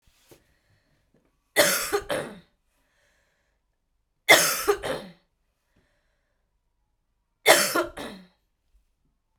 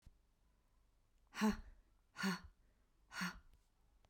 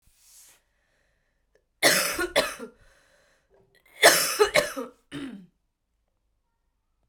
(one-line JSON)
{"three_cough_length": "9.4 s", "three_cough_amplitude": 28012, "three_cough_signal_mean_std_ratio": 0.29, "exhalation_length": "4.1 s", "exhalation_amplitude": 1687, "exhalation_signal_mean_std_ratio": 0.33, "cough_length": "7.1 s", "cough_amplitude": 25549, "cough_signal_mean_std_ratio": 0.32, "survey_phase": "beta (2021-08-13 to 2022-03-07)", "age": "45-64", "gender": "Female", "wearing_mask": "Yes", "symptom_cough_any": true, "symptom_runny_or_blocked_nose": true, "smoker_status": "Never smoked", "respiratory_condition_asthma": false, "respiratory_condition_other": false, "recruitment_source": "Test and Trace", "submission_delay": "1 day", "covid_test_result": "Positive", "covid_test_method": "RT-qPCR"}